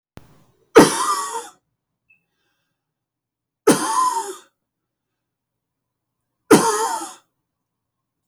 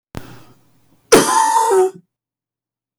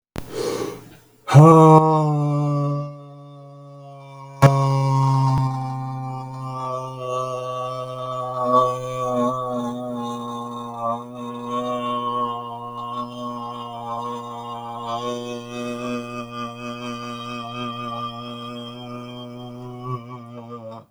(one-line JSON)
{"three_cough_length": "8.3 s", "three_cough_amplitude": 32768, "three_cough_signal_mean_std_ratio": 0.31, "cough_length": "3.0 s", "cough_amplitude": 32768, "cough_signal_mean_std_ratio": 0.45, "exhalation_length": "20.9 s", "exhalation_amplitude": 32768, "exhalation_signal_mean_std_ratio": 0.59, "survey_phase": "beta (2021-08-13 to 2022-03-07)", "age": "45-64", "gender": "Male", "wearing_mask": "No", "symptom_none": true, "smoker_status": "Never smoked", "respiratory_condition_asthma": false, "respiratory_condition_other": false, "recruitment_source": "REACT", "submission_delay": "0 days", "covid_test_result": "Negative", "covid_test_method": "RT-qPCR"}